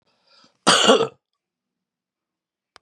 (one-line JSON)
{"cough_length": "2.8 s", "cough_amplitude": 29844, "cough_signal_mean_std_ratio": 0.29, "survey_phase": "beta (2021-08-13 to 2022-03-07)", "age": "45-64", "gender": "Female", "wearing_mask": "No", "symptom_cough_any": true, "symptom_new_continuous_cough": true, "symptom_runny_or_blocked_nose": true, "symptom_sore_throat": true, "symptom_fatigue": true, "symptom_fever_high_temperature": true, "symptom_headache": true, "symptom_onset": "6 days", "smoker_status": "Never smoked", "respiratory_condition_asthma": false, "respiratory_condition_other": false, "recruitment_source": "Test and Trace", "submission_delay": "4 days", "covid_test_result": "Positive", "covid_test_method": "ePCR"}